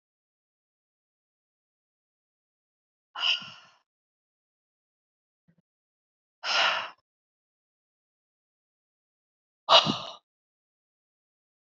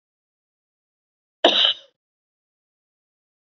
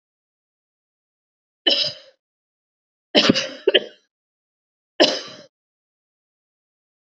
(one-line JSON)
{"exhalation_length": "11.6 s", "exhalation_amplitude": 19971, "exhalation_signal_mean_std_ratio": 0.19, "cough_length": "3.5 s", "cough_amplitude": 28390, "cough_signal_mean_std_ratio": 0.22, "three_cough_length": "7.1 s", "three_cough_amplitude": 32767, "three_cough_signal_mean_std_ratio": 0.25, "survey_phase": "beta (2021-08-13 to 2022-03-07)", "age": "45-64", "gender": "Female", "wearing_mask": "No", "symptom_none": true, "smoker_status": "Ex-smoker", "respiratory_condition_asthma": false, "respiratory_condition_other": false, "recruitment_source": "REACT", "submission_delay": "3 days", "covid_test_result": "Negative", "covid_test_method": "RT-qPCR", "influenza_a_test_result": "Negative", "influenza_b_test_result": "Negative"}